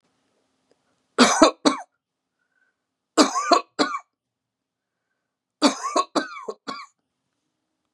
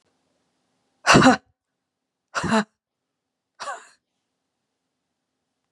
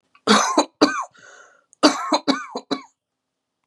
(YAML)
three_cough_length: 7.9 s
three_cough_amplitude: 32767
three_cough_signal_mean_std_ratio: 0.3
exhalation_length: 5.7 s
exhalation_amplitude: 29014
exhalation_signal_mean_std_ratio: 0.23
cough_length: 3.7 s
cough_amplitude: 31424
cough_signal_mean_std_ratio: 0.4
survey_phase: beta (2021-08-13 to 2022-03-07)
age: 45-64
gender: Female
wearing_mask: 'No'
symptom_none: true
smoker_status: Ex-smoker
respiratory_condition_asthma: false
respiratory_condition_other: false
recruitment_source: REACT
submission_delay: 1 day
covid_test_result: Negative
covid_test_method: RT-qPCR